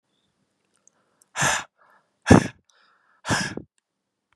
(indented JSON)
{
  "exhalation_length": "4.4 s",
  "exhalation_amplitude": 32209,
  "exhalation_signal_mean_std_ratio": 0.24,
  "survey_phase": "beta (2021-08-13 to 2022-03-07)",
  "age": "18-44",
  "gender": "Male",
  "wearing_mask": "No",
  "symptom_none": true,
  "smoker_status": "Never smoked",
  "respiratory_condition_asthma": false,
  "respiratory_condition_other": false,
  "recruitment_source": "REACT",
  "submission_delay": "1 day",
  "covid_test_result": "Negative",
  "covid_test_method": "RT-qPCR"
}